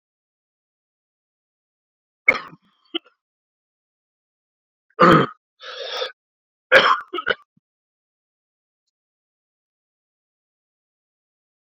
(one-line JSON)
{"cough_length": "11.8 s", "cough_amplitude": 27827, "cough_signal_mean_std_ratio": 0.2, "survey_phase": "beta (2021-08-13 to 2022-03-07)", "age": "18-44", "gender": "Male", "wearing_mask": "No", "symptom_cough_any": true, "symptom_new_continuous_cough": true, "symptom_runny_or_blocked_nose": true, "symptom_shortness_of_breath": true, "symptom_fatigue": true, "symptom_other": true, "symptom_onset": "3 days", "smoker_status": "Ex-smoker", "respiratory_condition_asthma": false, "respiratory_condition_other": false, "recruitment_source": "Test and Trace", "submission_delay": "2 days", "covid_test_result": "Positive", "covid_test_method": "ePCR"}